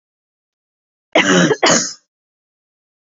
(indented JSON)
{
  "three_cough_length": "3.2 s",
  "three_cough_amplitude": 31484,
  "three_cough_signal_mean_std_ratio": 0.37,
  "survey_phase": "beta (2021-08-13 to 2022-03-07)",
  "age": "45-64",
  "gender": "Female",
  "wearing_mask": "No",
  "symptom_none": true,
  "smoker_status": "Never smoked",
  "respiratory_condition_asthma": false,
  "respiratory_condition_other": false,
  "recruitment_source": "REACT",
  "submission_delay": "1 day",
  "covid_test_result": "Negative",
  "covid_test_method": "RT-qPCR"
}